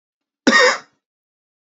cough_length: 1.8 s
cough_amplitude: 27776
cough_signal_mean_std_ratio: 0.33
survey_phase: beta (2021-08-13 to 2022-03-07)
age: 18-44
gender: Male
wearing_mask: 'No'
symptom_cough_any: true
symptom_runny_or_blocked_nose: true
symptom_onset: 12 days
smoker_status: Never smoked
respiratory_condition_asthma: false
respiratory_condition_other: false
recruitment_source: REACT
submission_delay: 2 days
covid_test_result: Negative
covid_test_method: RT-qPCR
influenza_a_test_result: Negative
influenza_b_test_result: Negative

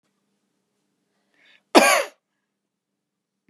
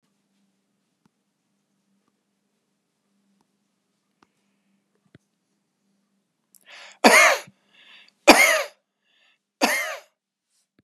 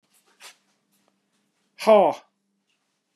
cough_length: 3.5 s
cough_amplitude: 32768
cough_signal_mean_std_ratio: 0.21
three_cough_length: 10.8 s
three_cough_amplitude: 32768
three_cough_signal_mean_std_ratio: 0.22
exhalation_length: 3.2 s
exhalation_amplitude: 22458
exhalation_signal_mean_std_ratio: 0.24
survey_phase: beta (2021-08-13 to 2022-03-07)
age: 45-64
gender: Male
wearing_mask: 'No'
symptom_fatigue: true
symptom_onset: 12 days
smoker_status: Never smoked
respiratory_condition_asthma: true
respiratory_condition_other: false
recruitment_source: REACT
submission_delay: 2 days
covid_test_result: Negative
covid_test_method: RT-qPCR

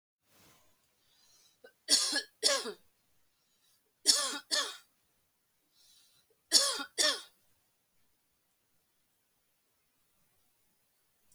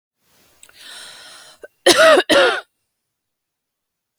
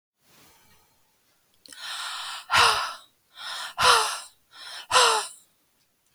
three_cough_length: 11.3 s
three_cough_amplitude: 12452
three_cough_signal_mean_std_ratio: 0.28
cough_length: 4.2 s
cough_amplitude: 32768
cough_signal_mean_std_ratio: 0.34
exhalation_length: 6.1 s
exhalation_amplitude: 22705
exhalation_signal_mean_std_ratio: 0.4
survey_phase: alpha (2021-03-01 to 2021-08-12)
age: 45-64
gender: Female
wearing_mask: 'No'
symptom_none: true
smoker_status: Ex-smoker
respiratory_condition_asthma: false
respiratory_condition_other: false
recruitment_source: REACT
submission_delay: 2 days
covid_test_result: Negative
covid_test_method: RT-qPCR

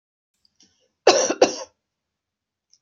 cough_length: 2.8 s
cough_amplitude: 30347
cough_signal_mean_std_ratio: 0.26
survey_phase: beta (2021-08-13 to 2022-03-07)
age: 45-64
gender: Female
wearing_mask: 'No'
symptom_none: true
smoker_status: Never smoked
respiratory_condition_asthma: false
respiratory_condition_other: false
recruitment_source: REACT
submission_delay: 2 days
covid_test_result: Negative
covid_test_method: RT-qPCR
influenza_a_test_result: Negative
influenza_b_test_result: Negative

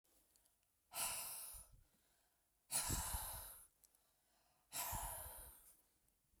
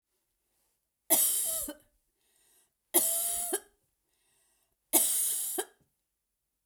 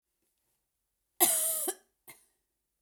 exhalation_length: 6.4 s
exhalation_amplitude: 1363
exhalation_signal_mean_std_ratio: 0.49
three_cough_length: 6.7 s
three_cough_amplitude: 13856
three_cough_signal_mean_std_ratio: 0.42
cough_length: 2.8 s
cough_amplitude: 11794
cough_signal_mean_std_ratio: 0.32
survey_phase: beta (2021-08-13 to 2022-03-07)
age: 45-64
gender: Female
wearing_mask: 'No'
symptom_none: true
smoker_status: Ex-smoker
respiratory_condition_asthma: true
respiratory_condition_other: false
recruitment_source: REACT
submission_delay: 1 day
covid_test_result: Negative
covid_test_method: RT-qPCR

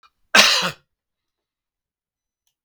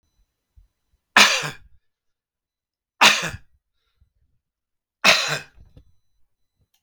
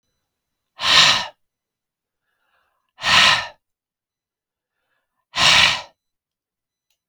cough_length: 2.6 s
cough_amplitude: 32768
cough_signal_mean_std_ratio: 0.26
three_cough_length: 6.8 s
three_cough_amplitude: 32768
three_cough_signal_mean_std_ratio: 0.26
exhalation_length: 7.1 s
exhalation_amplitude: 32768
exhalation_signal_mean_std_ratio: 0.33
survey_phase: beta (2021-08-13 to 2022-03-07)
age: 65+
gender: Male
wearing_mask: 'No'
symptom_none: true
smoker_status: Never smoked
respiratory_condition_asthma: false
respiratory_condition_other: false
recruitment_source: REACT
submission_delay: 2 days
covid_test_result: Negative
covid_test_method: RT-qPCR
influenza_a_test_result: Negative
influenza_b_test_result: Negative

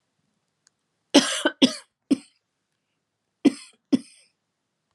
cough_length: 4.9 s
cough_amplitude: 27857
cough_signal_mean_std_ratio: 0.24
survey_phase: alpha (2021-03-01 to 2021-08-12)
age: 45-64
gender: Female
wearing_mask: 'No'
symptom_cough_any: true
symptom_abdominal_pain: true
symptom_fatigue: true
symptom_headache: true
symptom_change_to_sense_of_smell_or_taste: true
smoker_status: Never smoked
respiratory_condition_asthma: false
respiratory_condition_other: false
recruitment_source: Test and Trace
submission_delay: 2 days
covid_test_result: Positive
covid_test_method: RT-qPCR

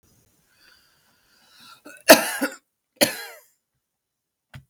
cough_length: 4.7 s
cough_amplitude: 32768
cough_signal_mean_std_ratio: 0.2
survey_phase: beta (2021-08-13 to 2022-03-07)
age: 65+
gender: Female
wearing_mask: 'No'
symptom_runny_or_blocked_nose: true
symptom_diarrhoea: true
smoker_status: Ex-smoker
respiratory_condition_asthma: false
respiratory_condition_other: false
recruitment_source: REACT
submission_delay: 3 days
covid_test_result: Negative
covid_test_method: RT-qPCR
influenza_a_test_result: Negative
influenza_b_test_result: Negative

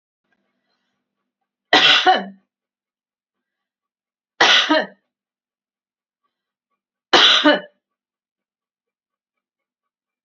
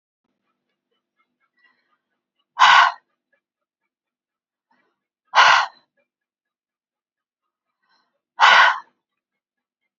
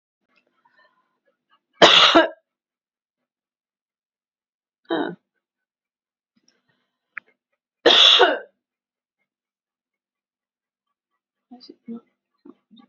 three_cough_length: 10.2 s
three_cough_amplitude: 30581
three_cough_signal_mean_std_ratio: 0.29
exhalation_length: 10.0 s
exhalation_amplitude: 31993
exhalation_signal_mean_std_ratio: 0.25
cough_length: 12.9 s
cough_amplitude: 31882
cough_signal_mean_std_ratio: 0.23
survey_phase: beta (2021-08-13 to 2022-03-07)
age: 45-64
gender: Female
wearing_mask: 'No'
symptom_none: true
smoker_status: Ex-smoker
respiratory_condition_asthma: false
respiratory_condition_other: false
recruitment_source: REACT
submission_delay: 5 days
covid_test_result: Negative
covid_test_method: RT-qPCR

